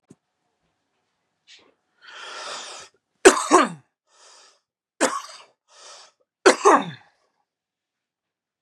{"three_cough_length": "8.6 s", "three_cough_amplitude": 32768, "three_cough_signal_mean_std_ratio": 0.24, "survey_phase": "beta (2021-08-13 to 2022-03-07)", "age": "45-64", "gender": "Male", "wearing_mask": "No", "symptom_none": true, "smoker_status": "Current smoker (e-cigarettes or vapes only)", "respiratory_condition_asthma": false, "respiratory_condition_other": false, "recruitment_source": "REACT", "submission_delay": "2 days", "covid_test_result": "Negative", "covid_test_method": "RT-qPCR", "influenza_a_test_result": "Unknown/Void", "influenza_b_test_result": "Unknown/Void"}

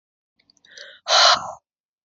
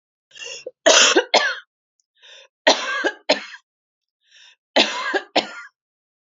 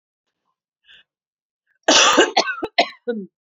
{"exhalation_length": "2.0 s", "exhalation_amplitude": 26746, "exhalation_signal_mean_std_ratio": 0.34, "three_cough_length": "6.4 s", "three_cough_amplitude": 32767, "three_cough_signal_mean_std_ratio": 0.38, "cough_length": "3.6 s", "cough_amplitude": 32571, "cough_signal_mean_std_ratio": 0.37, "survey_phase": "beta (2021-08-13 to 2022-03-07)", "age": "45-64", "gender": "Female", "wearing_mask": "No", "symptom_none": true, "smoker_status": "Never smoked", "respiratory_condition_asthma": false, "respiratory_condition_other": false, "recruitment_source": "REACT", "submission_delay": "1 day", "covid_test_result": "Negative", "covid_test_method": "RT-qPCR"}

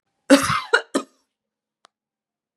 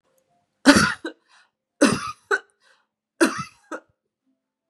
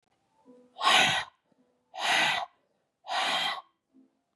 {"cough_length": "2.6 s", "cough_amplitude": 32595, "cough_signal_mean_std_ratio": 0.29, "three_cough_length": "4.7 s", "three_cough_amplitude": 32767, "three_cough_signal_mean_std_ratio": 0.3, "exhalation_length": "4.4 s", "exhalation_amplitude": 11150, "exhalation_signal_mean_std_ratio": 0.46, "survey_phase": "beta (2021-08-13 to 2022-03-07)", "age": "18-44", "gender": "Female", "wearing_mask": "No", "symptom_cough_any": true, "symptom_runny_or_blocked_nose": true, "symptom_sore_throat": true, "symptom_fever_high_temperature": true, "symptom_onset": "2 days", "smoker_status": "Ex-smoker", "respiratory_condition_asthma": false, "respiratory_condition_other": false, "recruitment_source": "Test and Trace", "submission_delay": "1 day", "covid_test_result": "Positive", "covid_test_method": "RT-qPCR", "covid_ct_value": 29.8, "covid_ct_gene": "ORF1ab gene", "covid_ct_mean": 30.5, "covid_viral_load": "100 copies/ml", "covid_viral_load_category": "Minimal viral load (< 10K copies/ml)"}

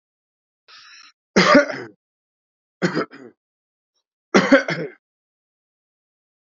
{"three_cough_length": "6.6 s", "three_cough_amplitude": 32620, "three_cough_signal_mean_std_ratio": 0.28, "survey_phase": "beta (2021-08-13 to 2022-03-07)", "age": "45-64", "gender": "Male", "wearing_mask": "No", "symptom_cough_any": true, "symptom_runny_or_blocked_nose": true, "symptom_diarrhoea": true, "symptom_fever_high_temperature": true, "symptom_headache": true, "symptom_change_to_sense_of_smell_or_taste": true, "symptom_loss_of_taste": true, "symptom_onset": "3 days", "smoker_status": "Ex-smoker", "respiratory_condition_asthma": false, "respiratory_condition_other": false, "recruitment_source": "Test and Trace", "submission_delay": "2 days", "covid_test_result": "Positive", "covid_test_method": "RT-qPCR", "covid_ct_value": 20.7, "covid_ct_gene": "ORF1ab gene"}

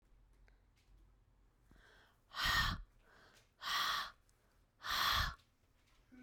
{"exhalation_length": "6.2 s", "exhalation_amplitude": 2704, "exhalation_signal_mean_std_ratio": 0.42, "survey_phase": "beta (2021-08-13 to 2022-03-07)", "age": "45-64", "gender": "Female", "wearing_mask": "No", "symptom_cough_any": true, "symptom_runny_or_blocked_nose": true, "symptom_shortness_of_breath": true, "symptom_abdominal_pain": true, "symptom_fatigue": true, "symptom_fever_high_temperature": true, "symptom_headache": true, "symptom_change_to_sense_of_smell_or_taste": true, "symptom_other": true, "symptom_onset": "4 days", "smoker_status": "Never smoked", "respiratory_condition_asthma": false, "respiratory_condition_other": false, "recruitment_source": "Test and Trace", "submission_delay": "2 days", "covid_test_result": "Positive", "covid_test_method": "RT-qPCR", "covid_ct_value": 20.6, "covid_ct_gene": "ORF1ab gene"}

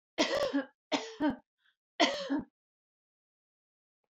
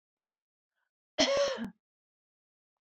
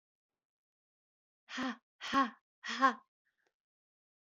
{"three_cough_length": "4.1 s", "three_cough_amplitude": 8992, "three_cough_signal_mean_std_ratio": 0.42, "cough_length": "2.8 s", "cough_amplitude": 9410, "cough_signal_mean_std_ratio": 0.33, "exhalation_length": "4.3 s", "exhalation_amplitude": 6220, "exhalation_signal_mean_std_ratio": 0.28, "survey_phase": "beta (2021-08-13 to 2022-03-07)", "age": "45-64", "gender": "Female", "wearing_mask": "No", "symptom_none": true, "smoker_status": "Ex-smoker", "respiratory_condition_asthma": false, "respiratory_condition_other": false, "recruitment_source": "REACT", "submission_delay": "2 days", "covid_test_result": "Negative", "covid_test_method": "RT-qPCR", "influenza_a_test_result": "Negative", "influenza_b_test_result": "Negative"}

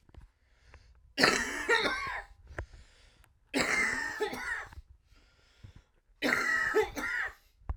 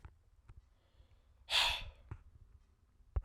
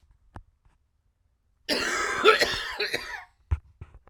{"three_cough_length": "7.8 s", "three_cough_amplitude": 16621, "three_cough_signal_mean_std_ratio": 0.54, "exhalation_length": "3.2 s", "exhalation_amplitude": 3665, "exhalation_signal_mean_std_ratio": 0.34, "cough_length": "4.1 s", "cough_amplitude": 21641, "cough_signal_mean_std_ratio": 0.42, "survey_phase": "beta (2021-08-13 to 2022-03-07)", "age": "18-44", "gender": "Male", "wearing_mask": "No", "symptom_cough_any": true, "symptom_runny_or_blocked_nose": true, "symptom_fatigue": true, "symptom_headache": true, "symptom_change_to_sense_of_smell_or_taste": true, "symptom_loss_of_taste": true, "symptom_onset": "3 days", "smoker_status": "Never smoked", "respiratory_condition_asthma": false, "respiratory_condition_other": false, "recruitment_source": "Test and Trace", "submission_delay": "2 days", "covid_test_result": "Positive", "covid_test_method": "RT-qPCR", "covid_ct_value": 13.0, "covid_ct_gene": "ORF1ab gene"}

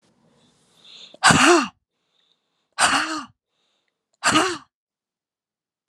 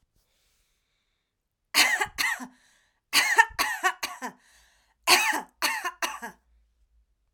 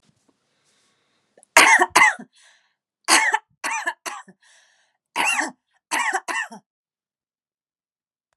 {"exhalation_length": "5.9 s", "exhalation_amplitude": 31822, "exhalation_signal_mean_std_ratio": 0.34, "three_cough_length": "7.3 s", "three_cough_amplitude": 26513, "three_cough_signal_mean_std_ratio": 0.38, "cough_length": "8.4 s", "cough_amplitude": 32768, "cough_signal_mean_std_ratio": 0.33, "survey_phase": "alpha (2021-03-01 to 2021-08-12)", "age": "45-64", "gender": "Female", "wearing_mask": "No", "symptom_none": true, "smoker_status": "Never smoked", "respiratory_condition_asthma": false, "respiratory_condition_other": false, "recruitment_source": "REACT", "submission_delay": "1 day", "covid_test_result": "Negative", "covid_test_method": "RT-qPCR"}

